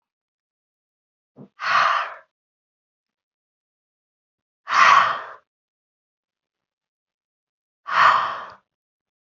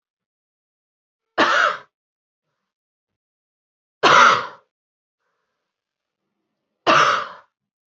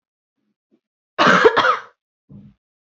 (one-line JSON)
{"exhalation_length": "9.2 s", "exhalation_amplitude": 26520, "exhalation_signal_mean_std_ratio": 0.3, "three_cough_length": "7.9 s", "three_cough_amplitude": 28206, "three_cough_signal_mean_std_ratio": 0.3, "cough_length": "2.8 s", "cough_amplitude": 28268, "cough_signal_mean_std_ratio": 0.36, "survey_phase": "beta (2021-08-13 to 2022-03-07)", "age": "18-44", "gender": "Female", "wearing_mask": "No", "symptom_cough_any": true, "symptom_runny_or_blocked_nose": true, "symptom_fatigue": true, "symptom_headache": true, "symptom_onset": "3 days", "smoker_status": "Never smoked", "respiratory_condition_asthma": false, "respiratory_condition_other": false, "recruitment_source": "REACT", "submission_delay": "1 day", "covid_test_result": "Positive", "covid_test_method": "RT-qPCR", "covid_ct_value": 17.3, "covid_ct_gene": "E gene", "influenza_a_test_result": "Negative", "influenza_b_test_result": "Negative"}